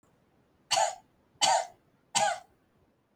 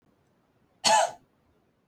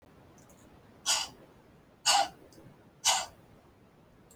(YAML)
three_cough_length: 3.2 s
three_cough_amplitude: 9789
three_cough_signal_mean_std_ratio: 0.38
cough_length: 1.9 s
cough_amplitude: 13513
cough_signal_mean_std_ratio: 0.31
exhalation_length: 4.4 s
exhalation_amplitude: 10029
exhalation_signal_mean_std_ratio: 0.34
survey_phase: beta (2021-08-13 to 2022-03-07)
age: 18-44
gender: Female
wearing_mask: 'No'
symptom_none: true
smoker_status: Never smoked
respiratory_condition_asthma: false
respiratory_condition_other: false
recruitment_source: REACT
submission_delay: 1 day
covid_test_result: Negative
covid_test_method: RT-qPCR